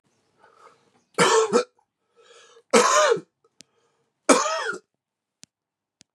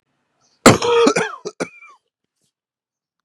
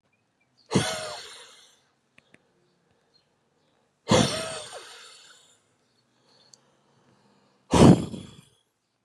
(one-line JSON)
{"three_cough_length": "6.1 s", "three_cough_amplitude": 28236, "three_cough_signal_mean_std_ratio": 0.36, "cough_length": "3.2 s", "cough_amplitude": 32768, "cough_signal_mean_std_ratio": 0.33, "exhalation_length": "9.0 s", "exhalation_amplitude": 25349, "exhalation_signal_mean_std_ratio": 0.24, "survey_phase": "beta (2021-08-13 to 2022-03-07)", "age": "45-64", "gender": "Male", "wearing_mask": "No", "symptom_runny_or_blocked_nose": true, "symptom_fatigue": true, "symptom_fever_high_temperature": true, "symptom_headache": true, "smoker_status": "Ex-smoker", "respiratory_condition_asthma": false, "respiratory_condition_other": false, "recruitment_source": "Test and Trace", "submission_delay": "2 days", "covid_test_result": "Positive", "covid_test_method": "LFT"}